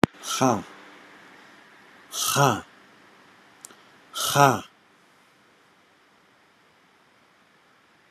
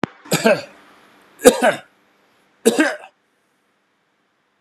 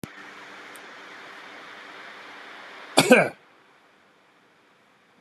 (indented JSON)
{
  "exhalation_length": "8.1 s",
  "exhalation_amplitude": 32491,
  "exhalation_signal_mean_std_ratio": 0.29,
  "three_cough_length": "4.6 s",
  "three_cough_amplitude": 32768,
  "three_cough_signal_mean_std_ratio": 0.31,
  "cough_length": "5.2 s",
  "cough_amplitude": 31891,
  "cough_signal_mean_std_ratio": 0.26,
  "survey_phase": "beta (2021-08-13 to 2022-03-07)",
  "age": "65+",
  "gender": "Male",
  "wearing_mask": "No",
  "symptom_none": true,
  "smoker_status": "Ex-smoker",
  "respiratory_condition_asthma": false,
  "respiratory_condition_other": false,
  "recruitment_source": "REACT",
  "submission_delay": "6 days",
  "covid_test_result": "Negative",
  "covid_test_method": "RT-qPCR"
}